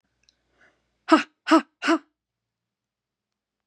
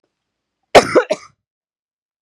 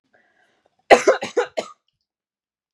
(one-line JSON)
{"exhalation_length": "3.7 s", "exhalation_amplitude": 26828, "exhalation_signal_mean_std_ratio": 0.24, "cough_length": "2.2 s", "cough_amplitude": 32768, "cough_signal_mean_std_ratio": 0.25, "three_cough_length": "2.7 s", "three_cough_amplitude": 32768, "three_cough_signal_mean_std_ratio": 0.25, "survey_phase": "beta (2021-08-13 to 2022-03-07)", "age": "18-44", "gender": "Female", "wearing_mask": "No", "symptom_cough_any": true, "symptom_fatigue": true, "symptom_headache": true, "symptom_onset": "12 days", "smoker_status": "Never smoked", "respiratory_condition_asthma": false, "respiratory_condition_other": false, "recruitment_source": "REACT", "submission_delay": "1 day", "covid_test_result": "Negative", "covid_test_method": "RT-qPCR"}